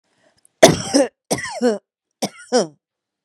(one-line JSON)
{"three_cough_length": "3.2 s", "three_cough_amplitude": 32768, "three_cough_signal_mean_std_ratio": 0.36, "survey_phase": "beta (2021-08-13 to 2022-03-07)", "age": "45-64", "gender": "Female", "wearing_mask": "No", "symptom_none": true, "smoker_status": "Ex-smoker", "respiratory_condition_asthma": false, "respiratory_condition_other": false, "recruitment_source": "REACT", "submission_delay": "-5 days", "covid_test_result": "Negative", "covid_test_method": "RT-qPCR", "influenza_a_test_result": "Unknown/Void", "influenza_b_test_result": "Unknown/Void"}